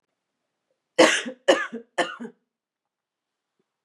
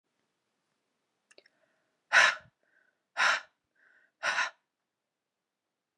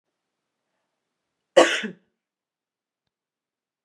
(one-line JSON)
{"three_cough_length": "3.8 s", "three_cough_amplitude": 27426, "three_cough_signal_mean_std_ratio": 0.27, "exhalation_length": "6.0 s", "exhalation_amplitude": 12778, "exhalation_signal_mean_std_ratio": 0.25, "cough_length": "3.8 s", "cough_amplitude": 27648, "cough_signal_mean_std_ratio": 0.17, "survey_phase": "beta (2021-08-13 to 2022-03-07)", "age": "18-44", "gender": "Female", "wearing_mask": "No", "symptom_runny_or_blocked_nose": true, "symptom_onset": "5 days", "smoker_status": "Never smoked", "respiratory_condition_asthma": true, "respiratory_condition_other": false, "recruitment_source": "Test and Trace", "submission_delay": "2 days", "covid_test_result": "Positive", "covid_test_method": "RT-qPCR", "covid_ct_value": 18.7, "covid_ct_gene": "ORF1ab gene", "covid_ct_mean": 19.0, "covid_viral_load": "570000 copies/ml", "covid_viral_load_category": "Low viral load (10K-1M copies/ml)"}